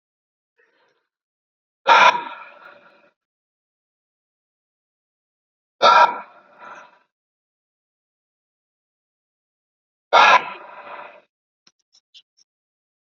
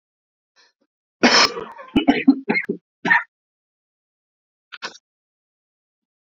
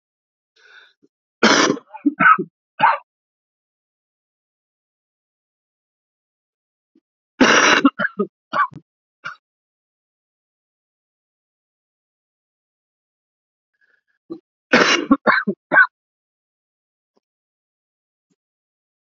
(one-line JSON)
{"exhalation_length": "13.1 s", "exhalation_amplitude": 29768, "exhalation_signal_mean_std_ratio": 0.22, "cough_length": "6.3 s", "cough_amplitude": 30460, "cough_signal_mean_std_ratio": 0.3, "three_cough_length": "19.0 s", "three_cough_amplitude": 29881, "three_cough_signal_mean_std_ratio": 0.26, "survey_phase": "alpha (2021-03-01 to 2021-08-12)", "age": "18-44", "gender": "Male", "wearing_mask": "No", "symptom_cough_any": true, "symptom_new_continuous_cough": true, "symptom_fatigue": true, "symptom_fever_high_temperature": true, "symptom_headache": true, "symptom_change_to_sense_of_smell_or_taste": true, "symptom_onset": "3 days", "smoker_status": "Never smoked", "respiratory_condition_asthma": false, "respiratory_condition_other": false, "recruitment_source": "Test and Trace", "submission_delay": "2 days", "covid_test_result": "Positive", "covid_test_method": "RT-qPCR", "covid_ct_value": 22.4, "covid_ct_gene": "ORF1ab gene"}